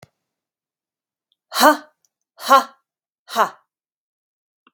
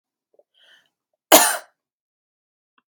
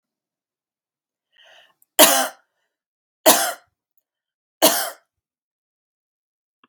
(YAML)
exhalation_length: 4.7 s
exhalation_amplitude: 32768
exhalation_signal_mean_std_ratio: 0.23
cough_length: 2.9 s
cough_amplitude: 32768
cough_signal_mean_std_ratio: 0.21
three_cough_length: 6.7 s
three_cough_amplitude: 32768
three_cough_signal_mean_std_ratio: 0.24
survey_phase: beta (2021-08-13 to 2022-03-07)
age: 18-44
gender: Female
wearing_mask: 'No'
symptom_none: true
smoker_status: Never smoked
respiratory_condition_asthma: false
respiratory_condition_other: false
recruitment_source: REACT
submission_delay: 5 days
covid_test_result: Negative
covid_test_method: RT-qPCR
influenza_a_test_result: Unknown/Void
influenza_b_test_result: Unknown/Void